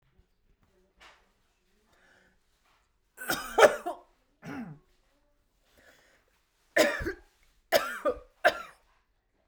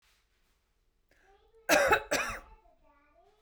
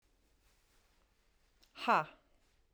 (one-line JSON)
{"three_cough_length": "9.5 s", "three_cough_amplitude": 20108, "three_cough_signal_mean_std_ratio": 0.25, "cough_length": "3.4 s", "cough_amplitude": 10217, "cough_signal_mean_std_ratio": 0.32, "exhalation_length": "2.7 s", "exhalation_amplitude": 4094, "exhalation_signal_mean_std_ratio": 0.21, "survey_phase": "beta (2021-08-13 to 2022-03-07)", "age": "18-44", "gender": "Female", "wearing_mask": "No", "symptom_none": true, "symptom_onset": "12 days", "smoker_status": "Never smoked", "respiratory_condition_asthma": false, "respiratory_condition_other": false, "recruitment_source": "REACT", "submission_delay": "0 days", "covid_test_result": "Negative", "covid_test_method": "RT-qPCR"}